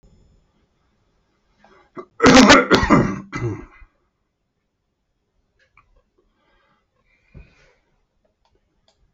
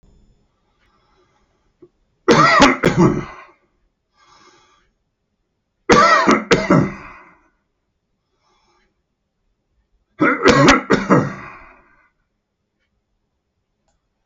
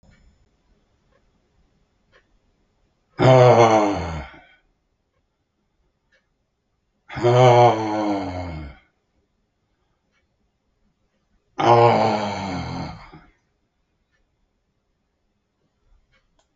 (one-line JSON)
{"cough_length": "9.1 s", "cough_amplitude": 32768, "cough_signal_mean_std_ratio": 0.25, "three_cough_length": "14.3 s", "three_cough_amplitude": 32768, "three_cough_signal_mean_std_ratio": 0.35, "exhalation_length": "16.6 s", "exhalation_amplitude": 32615, "exhalation_signal_mean_std_ratio": 0.34, "survey_phase": "alpha (2021-03-01 to 2021-08-12)", "age": "65+", "gender": "Male", "wearing_mask": "No", "symptom_none": true, "smoker_status": "Prefer not to say", "respiratory_condition_asthma": false, "respiratory_condition_other": false, "recruitment_source": "REACT", "submission_delay": "1 day", "covid_test_result": "Negative", "covid_test_method": "RT-qPCR", "covid_ct_value": 45.0, "covid_ct_gene": "N gene"}